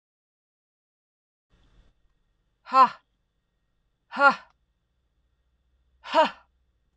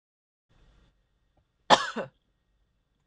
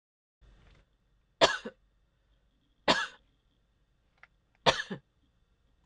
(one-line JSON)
{"exhalation_length": "7.0 s", "exhalation_amplitude": 19347, "exhalation_signal_mean_std_ratio": 0.21, "cough_length": "3.1 s", "cough_amplitude": 25525, "cough_signal_mean_std_ratio": 0.17, "three_cough_length": "5.9 s", "three_cough_amplitude": 14220, "three_cough_signal_mean_std_ratio": 0.22, "survey_phase": "beta (2021-08-13 to 2022-03-07)", "age": "45-64", "gender": "Female", "wearing_mask": "No", "symptom_cough_any": true, "symptom_new_continuous_cough": true, "symptom_runny_or_blocked_nose": true, "symptom_shortness_of_breath": true, "symptom_sore_throat": true, "symptom_fatigue": true, "symptom_other": true, "symptom_onset": "2 days", "smoker_status": "Never smoked", "respiratory_condition_asthma": false, "respiratory_condition_other": false, "recruitment_source": "Test and Trace", "submission_delay": "1 day", "covid_test_result": "Positive", "covid_test_method": "LAMP"}